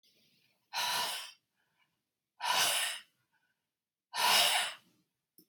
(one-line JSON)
{"exhalation_length": "5.5 s", "exhalation_amplitude": 6517, "exhalation_signal_mean_std_ratio": 0.44, "survey_phase": "beta (2021-08-13 to 2022-03-07)", "age": "45-64", "gender": "Female", "wearing_mask": "No", "symptom_none": true, "smoker_status": "Never smoked", "respiratory_condition_asthma": false, "respiratory_condition_other": false, "recruitment_source": "REACT", "submission_delay": "8 days", "covid_test_result": "Negative", "covid_test_method": "RT-qPCR", "influenza_a_test_result": "Negative", "influenza_b_test_result": "Negative"}